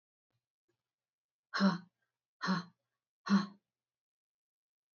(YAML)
exhalation_length: 4.9 s
exhalation_amplitude: 4054
exhalation_signal_mean_std_ratio: 0.27
survey_phase: alpha (2021-03-01 to 2021-08-12)
age: 45-64
gender: Female
wearing_mask: 'No'
symptom_none: true
smoker_status: Never smoked
respiratory_condition_asthma: false
respiratory_condition_other: false
recruitment_source: REACT
submission_delay: 2 days
covid_test_result: Negative
covid_test_method: RT-qPCR